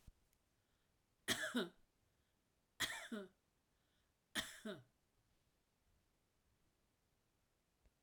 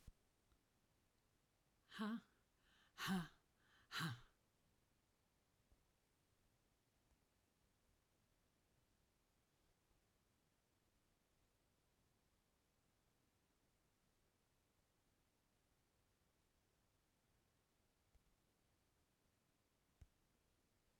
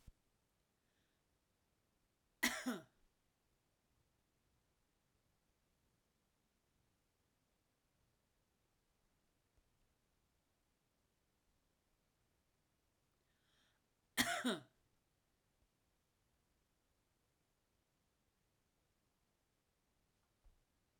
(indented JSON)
{
  "three_cough_length": "8.0 s",
  "three_cough_amplitude": 1704,
  "three_cough_signal_mean_std_ratio": 0.29,
  "exhalation_length": "21.0 s",
  "exhalation_amplitude": 647,
  "exhalation_signal_mean_std_ratio": 0.22,
  "cough_length": "21.0 s",
  "cough_amplitude": 2808,
  "cough_signal_mean_std_ratio": 0.16,
  "survey_phase": "alpha (2021-03-01 to 2021-08-12)",
  "age": "65+",
  "gender": "Female",
  "wearing_mask": "No",
  "symptom_none": true,
  "smoker_status": "Ex-smoker",
  "respiratory_condition_asthma": false,
  "respiratory_condition_other": false,
  "recruitment_source": "REACT",
  "submission_delay": "1 day",
  "covid_test_result": "Negative",
  "covid_test_method": "RT-qPCR"
}